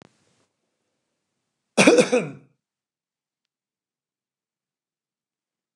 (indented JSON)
{
  "cough_length": "5.8 s",
  "cough_amplitude": 29203,
  "cough_signal_mean_std_ratio": 0.21,
  "survey_phase": "beta (2021-08-13 to 2022-03-07)",
  "age": "45-64",
  "gender": "Male",
  "wearing_mask": "No",
  "symptom_none": true,
  "symptom_onset": "7 days",
  "smoker_status": "Current smoker (1 to 10 cigarettes per day)",
  "respiratory_condition_asthma": false,
  "respiratory_condition_other": false,
  "recruitment_source": "REACT",
  "submission_delay": "1 day",
  "covid_test_result": "Negative",
  "covid_test_method": "RT-qPCR",
  "influenza_a_test_result": "Negative",
  "influenza_b_test_result": "Negative"
}